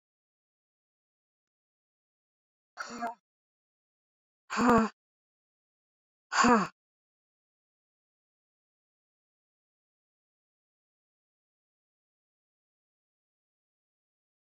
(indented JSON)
{
  "exhalation_length": "14.5 s",
  "exhalation_amplitude": 8856,
  "exhalation_signal_mean_std_ratio": 0.18,
  "survey_phase": "beta (2021-08-13 to 2022-03-07)",
  "age": "45-64",
  "gender": "Female",
  "wearing_mask": "No",
  "symptom_cough_any": true,
  "symptom_fatigue": true,
  "symptom_headache": true,
  "symptom_change_to_sense_of_smell_or_taste": true,
  "symptom_loss_of_taste": true,
  "symptom_onset": "5 days",
  "smoker_status": "Never smoked",
  "respiratory_condition_asthma": false,
  "respiratory_condition_other": false,
  "recruitment_source": "Test and Trace",
  "submission_delay": "2 days",
  "covid_test_result": "Positive",
  "covid_test_method": "RT-qPCR",
  "covid_ct_value": 17.6,
  "covid_ct_gene": "ORF1ab gene",
  "covid_ct_mean": 17.9,
  "covid_viral_load": "1400000 copies/ml",
  "covid_viral_load_category": "High viral load (>1M copies/ml)"
}